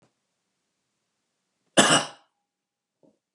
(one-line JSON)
{"cough_length": "3.3 s", "cough_amplitude": 23953, "cough_signal_mean_std_ratio": 0.22, "survey_phase": "beta (2021-08-13 to 2022-03-07)", "age": "45-64", "gender": "Male", "wearing_mask": "No", "symptom_none": true, "smoker_status": "Ex-smoker", "respiratory_condition_asthma": false, "respiratory_condition_other": false, "recruitment_source": "REACT", "submission_delay": "4 days", "covid_test_result": "Negative", "covid_test_method": "RT-qPCR", "influenza_a_test_result": "Negative", "influenza_b_test_result": "Negative"}